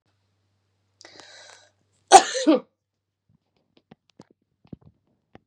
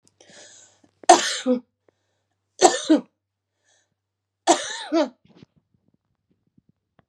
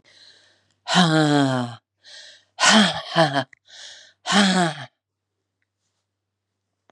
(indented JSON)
{
  "cough_length": "5.5 s",
  "cough_amplitude": 32768,
  "cough_signal_mean_std_ratio": 0.17,
  "three_cough_length": "7.1 s",
  "three_cough_amplitude": 32765,
  "three_cough_signal_mean_std_ratio": 0.27,
  "exhalation_length": "6.9 s",
  "exhalation_amplitude": 27871,
  "exhalation_signal_mean_std_ratio": 0.42,
  "survey_phase": "beta (2021-08-13 to 2022-03-07)",
  "age": "45-64",
  "gender": "Female",
  "wearing_mask": "No",
  "symptom_cough_any": true,
  "symptom_runny_or_blocked_nose": true,
  "symptom_fatigue": true,
  "symptom_onset": "5 days",
  "smoker_status": "Never smoked",
  "respiratory_condition_asthma": false,
  "respiratory_condition_other": false,
  "recruitment_source": "REACT",
  "submission_delay": "3 days",
  "covid_test_result": "Positive",
  "covid_test_method": "RT-qPCR",
  "covid_ct_value": 18.8,
  "covid_ct_gene": "E gene",
  "influenza_a_test_result": "Negative",
  "influenza_b_test_result": "Negative"
}